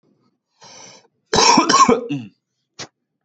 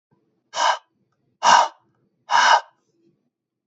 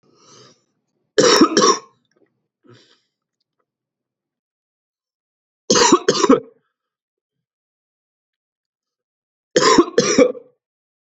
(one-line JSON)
{"cough_length": "3.2 s", "cough_amplitude": 30852, "cough_signal_mean_std_ratio": 0.4, "exhalation_length": "3.7 s", "exhalation_amplitude": 26862, "exhalation_signal_mean_std_ratio": 0.36, "three_cough_length": "11.1 s", "three_cough_amplitude": 30236, "three_cough_signal_mean_std_ratio": 0.31, "survey_phase": "beta (2021-08-13 to 2022-03-07)", "age": "18-44", "gender": "Male", "wearing_mask": "No", "symptom_cough_any": true, "symptom_runny_or_blocked_nose": true, "symptom_sore_throat": true, "symptom_diarrhoea": true, "symptom_headache": true, "smoker_status": "Never smoked", "respiratory_condition_asthma": false, "respiratory_condition_other": false, "recruitment_source": "Test and Trace", "submission_delay": "2 days", "covid_test_result": "Positive", "covid_test_method": "RT-qPCR", "covid_ct_value": 15.0, "covid_ct_gene": "ORF1ab gene"}